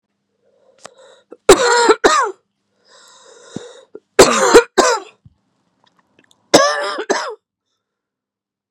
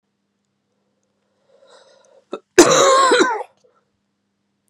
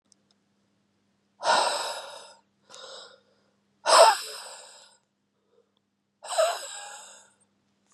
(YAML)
three_cough_length: 8.7 s
three_cough_amplitude: 32768
three_cough_signal_mean_std_ratio: 0.36
cough_length: 4.7 s
cough_amplitude: 32768
cough_signal_mean_std_ratio: 0.34
exhalation_length: 7.9 s
exhalation_amplitude: 23077
exhalation_signal_mean_std_ratio: 0.3
survey_phase: beta (2021-08-13 to 2022-03-07)
age: 18-44
gender: Female
wearing_mask: 'No'
symptom_cough_any: true
smoker_status: Current smoker (e-cigarettes or vapes only)
respiratory_condition_asthma: false
respiratory_condition_other: false
recruitment_source: REACT
submission_delay: 1 day
covid_test_result: Negative
covid_test_method: RT-qPCR
influenza_a_test_result: Negative
influenza_b_test_result: Negative